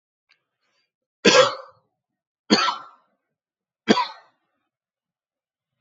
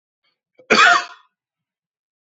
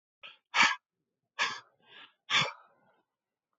{"three_cough_length": "5.8 s", "three_cough_amplitude": 31565, "three_cough_signal_mean_std_ratio": 0.26, "cough_length": "2.2 s", "cough_amplitude": 28955, "cough_signal_mean_std_ratio": 0.31, "exhalation_length": "3.6 s", "exhalation_amplitude": 10005, "exhalation_signal_mean_std_ratio": 0.31, "survey_phase": "alpha (2021-03-01 to 2021-08-12)", "age": "18-44", "gender": "Male", "wearing_mask": "No", "symptom_none": true, "smoker_status": "Never smoked", "respiratory_condition_asthma": false, "respiratory_condition_other": false, "recruitment_source": "REACT", "submission_delay": "2 days", "covid_test_result": "Negative", "covid_test_method": "RT-qPCR"}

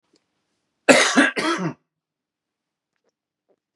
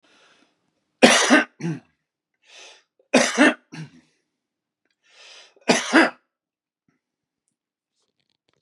{"cough_length": "3.8 s", "cough_amplitude": 32749, "cough_signal_mean_std_ratio": 0.31, "three_cough_length": "8.6 s", "three_cough_amplitude": 32768, "three_cough_signal_mean_std_ratio": 0.29, "survey_phase": "beta (2021-08-13 to 2022-03-07)", "age": "45-64", "gender": "Male", "wearing_mask": "No", "symptom_none": true, "smoker_status": "Ex-smoker", "respiratory_condition_asthma": false, "respiratory_condition_other": false, "recruitment_source": "REACT", "submission_delay": "-1 day", "covid_test_result": "Negative", "covid_test_method": "RT-qPCR", "influenza_a_test_result": "Unknown/Void", "influenza_b_test_result": "Unknown/Void"}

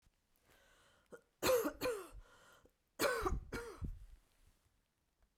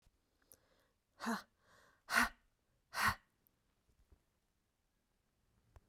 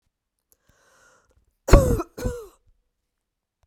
{"three_cough_length": "5.4 s", "three_cough_amplitude": 2592, "three_cough_signal_mean_std_ratio": 0.41, "exhalation_length": "5.9 s", "exhalation_amplitude": 5249, "exhalation_signal_mean_std_ratio": 0.24, "cough_length": "3.7 s", "cough_amplitude": 32768, "cough_signal_mean_std_ratio": 0.22, "survey_phase": "beta (2021-08-13 to 2022-03-07)", "age": "45-64", "gender": "Female", "wearing_mask": "No", "symptom_cough_any": true, "symptom_sore_throat": true, "symptom_fatigue": true, "symptom_headache": true, "symptom_onset": "9 days", "smoker_status": "Never smoked", "respiratory_condition_asthma": false, "respiratory_condition_other": false, "recruitment_source": "REACT", "submission_delay": "2 days", "covid_test_result": "Negative", "covid_test_method": "RT-qPCR"}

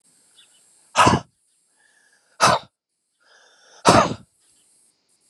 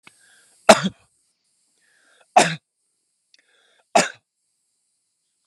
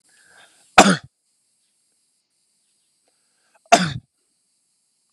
{"exhalation_length": "5.3 s", "exhalation_amplitude": 31680, "exhalation_signal_mean_std_ratio": 0.28, "three_cough_length": "5.5 s", "three_cough_amplitude": 32768, "three_cough_signal_mean_std_ratio": 0.19, "cough_length": "5.1 s", "cough_amplitude": 32768, "cough_signal_mean_std_ratio": 0.19, "survey_phase": "alpha (2021-03-01 to 2021-08-12)", "age": "45-64", "gender": "Male", "wearing_mask": "No", "symptom_none": true, "smoker_status": "Never smoked", "respiratory_condition_asthma": false, "respiratory_condition_other": false, "recruitment_source": "REACT", "submission_delay": "4 days", "covid_test_result": "Negative", "covid_test_method": "RT-qPCR"}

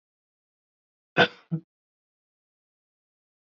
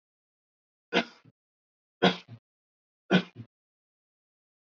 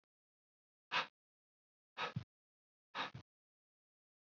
{"cough_length": "3.4 s", "cough_amplitude": 19310, "cough_signal_mean_std_ratio": 0.16, "three_cough_length": "4.7 s", "three_cough_amplitude": 15014, "three_cough_signal_mean_std_ratio": 0.21, "exhalation_length": "4.3 s", "exhalation_amplitude": 1891, "exhalation_signal_mean_std_ratio": 0.25, "survey_phase": "beta (2021-08-13 to 2022-03-07)", "age": "18-44", "gender": "Male", "wearing_mask": "No", "symptom_other": true, "smoker_status": "Never smoked", "respiratory_condition_asthma": false, "respiratory_condition_other": false, "recruitment_source": "Test and Trace", "submission_delay": "2 days", "covid_test_result": "Positive", "covid_test_method": "RT-qPCR", "covid_ct_value": 28.5, "covid_ct_gene": "N gene", "covid_ct_mean": 28.7, "covid_viral_load": "390 copies/ml", "covid_viral_load_category": "Minimal viral load (< 10K copies/ml)"}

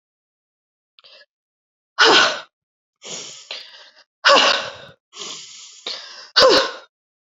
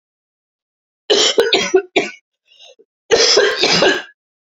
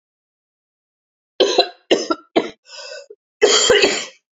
{"exhalation_length": "7.3 s", "exhalation_amplitude": 31354, "exhalation_signal_mean_std_ratio": 0.35, "cough_length": "4.4 s", "cough_amplitude": 31127, "cough_signal_mean_std_ratio": 0.52, "three_cough_length": "4.4 s", "three_cough_amplitude": 31059, "three_cough_signal_mean_std_ratio": 0.42, "survey_phase": "beta (2021-08-13 to 2022-03-07)", "age": "45-64", "gender": "Female", "wearing_mask": "No", "symptom_runny_or_blocked_nose": true, "symptom_diarrhoea": true, "symptom_fatigue": true, "symptom_headache": true, "symptom_change_to_sense_of_smell_or_taste": true, "symptom_loss_of_taste": true, "symptom_onset": "4 days", "smoker_status": "Current smoker (1 to 10 cigarettes per day)", "respiratory_condition_asthma": false, "respiratory_condition_other": false, "recruitment_source": "Test and Trace", "submission_delay": "2 days", "covid_test_result": "Positive", "covid_test_method": "RT-qPCR", "covid_ct_value": 23.2, "covid_ct_gene": "ORF1ab gene", "covid_ct_mean": 23.7, "covid_viral_load": "17000 copies/ml", "covid_viral_load_category": "Low viral load (10K-1M copies/ml)"}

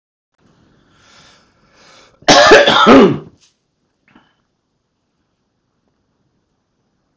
{"cough_length": "7.2 s", "cough_amplitude": 32768, "cough_signal_mean_std_ratio": 0.3, "survey_phase": "beta (2021-08-13 to 2022-03-07)", "age": "45-64", "gender": "Male", "wearing_mask": "No", "symptom_none": true, "smoker_status": "Ex-smoker", "respiratory_condition_asthma": false, "respiratory_condition_other": false, "recruitment_source": "REACT", "submission_delay": "1 day", "covid_test_result": "Negative", "covid_test_method": "RT-qPCR"}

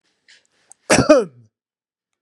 {"cough_length": "2.2 s", "cough_amplitude": 32767, "cough_signal_mean_std_ratio": 0.29, "survey_phase": "beta (2021-08-13 to 2022-03-07)", "age": "65+", "gender": "Male", "wearing_mask": "No", "symptom_none": true, "smoker_status": "Ex-smoker", "respiratory_condition_asthma": false, "respiratory_condition_other": false, "recruitment_source": "REACT", "submission_delay": "1 day", "covid_test_result": "Negative", "covid_test_method": "RT-qPCR", "influenza_a_test_result": "Negative", "influenza_b_test_result": "Negative"}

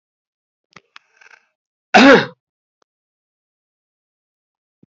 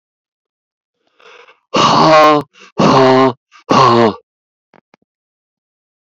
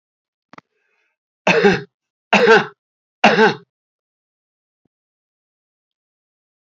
{"cough_length": "4.9 s", "cough_amplitude": 28466, "cough_signal_mean_std_ratio": 0.21, "exhalation_length": "6.1 s", "exhalation_amplitude": 29874, "exhalation_signal_mean_std_ratio": 0.46, "three_cough_length": "6.7 s", "three_cough_amplitude": 29179, "three_cough_signal_mean_std_ratio": 0.29, "survey_phase": "beta (2021-08-13 to 2022-03-07)", "age": "65+", "gender": "Male", "wearing_mask": "No", "symptom_cough_any": true, "symptom_runny_or_blocked_nose": true, "symptom_headache": true, "symptom_onset": "5 days", "smoker_status": "Never smoked", "respiratory_condition_asthma": false, "respiratory_condition_other": false, "recruitment_source": "Test and Trace", "submission_delay": "1 day", "covid_test_result": "Positive", "covid_test_method": "RT-qPCR", "covid_ct_value": 16.2, "covid_ct_gene": "ORF1ab gene", "covid_ct_mean": 16.8, "covid_viral_load": "3200000 copies/ml", "covid_viral_load_category": "High viral load (>1M copies/ml)"}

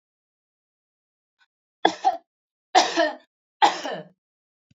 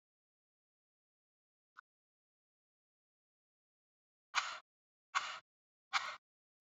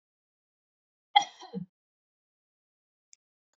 {"three_cough_length": "4.8 s", "three_cough_amplitude": 25968, "three_cough_signal_mean_std_ratio": 0.29, "exhalation_length": "6.7 s", "exhalation_amplitude": 3548, "exhalation_signal_mean_std_ratio": 0.2, "cough_length": "3.6 s", "cough_amplitude": 17333, "cough_signal_mean_std_ratio": 0.13, "survey_phase": "beta (2021-08-13 to 2022-03-07)", "age": "45-64", "gender": "Female", "wearing_mask": "No", "symptom_none": true, "smoker_status": "Never smoked", "respiratory_condition_asthma": false, "respiratory_condition_other": false, "recruitment_source": "REACT", "submission_delay": "1 day", "covid_test_result": "Negative", "covid_test_method": "RT-qPCR"}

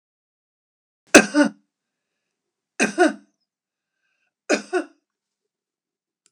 {"cough_length": "6.3 s", "cough_amplitude": 32768, "cough_signal_mean_std_ratio": 0.22, "survey_phase": "beta (2021-08-13 to 2022-03-07)", "age": "65+", "gender": "Female", "wearing_mask": "No", "symptom_none": true, "smoker_status": "Ex-smoker", "respiratory_condition_asthma": false, "respiratory_condition_other": false, "recruitment_source": "REACT", "submission_delay": "0 days", "covid_test_result": "Negative", "covid_test_method": "RT-qPCR", "influenza_a_test_result": "Negative", "influenza_b_test_result": "Negative"}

